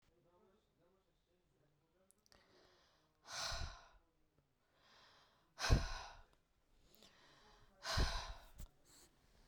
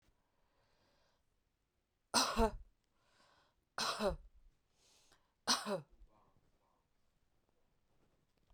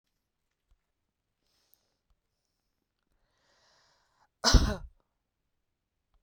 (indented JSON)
{
  "exhalation_length": "9.5 s",
  "exhalation_amplitude": 3914,
  "exhalation_signal_mean_std_ratio": 0.29,
  "three_cough_length": "8.5 s",
  "three_cough_amplitude": 5500,
  "three_cough_signal_mean_std_ratio": 0.28,
  "cough_length": "6.2 s",
  "cough_amplitude": 14462,
  "cough_signal_mean_std_ratio": 0.15,
  "survey_phase": "beta (2021-08-13 to 2022-03-07)",
  "age": "45-64",
  "gender": "Female",
  "wearing_mask": "Yes",
  "symptom_none": true,
  "smoker_status": "Never smoked",
  "respiratory_condition_asthma": false,
  "respiratory_condition_other": false,
  "recruitment_source": "REACT",
  "submission_delay": "3 days",
  "covid_test_result": "Negative",
  "covid_test_method": "RT-qPCR"
}